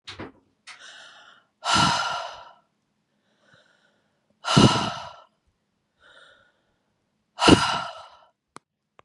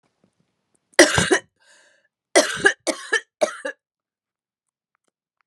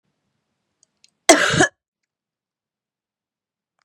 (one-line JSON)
{"exhalation_length": "9.0 s", "exhalation_amplitude": 31261, "exhalation_signal_mean_std_ratio": 0.3, "three_cough_length": "5.5 s", "three_cough_amplitude": 32768, "three_cough_signal_mean_std_ratio": 0.29, "cough_length": "3.8 s", "cough_amplitude": 32768, "cough_signal_mean_std_ratio": 0.22, "survey_phase": "beta (2021-08-13 to 2022-03-07)", "age": "45-64", "gender": "Female", "wearing_mask": "No", "symptom_cough_any": true, "symptom_runny_or_blocked_nose": true, "symptom_shortness_of_breath": true, "symptom_sore_throat": true, "symptom_abdominal_pain": true, "symptom_headache": true, "symptom_other": true, "symptom_onset": "4 days", "smoker_status": "Never smoked", "respiratory_condition_asthma": false, "respiratory_condition_other": false, "recruitment_source": "Test and Trace", "submission_delay": "2 days", "covid_test_result": "Positive", "covid_test_method": "RT-qPCR", "covid_ct_value": 24.0, "covid_ct_gene": "N gene"}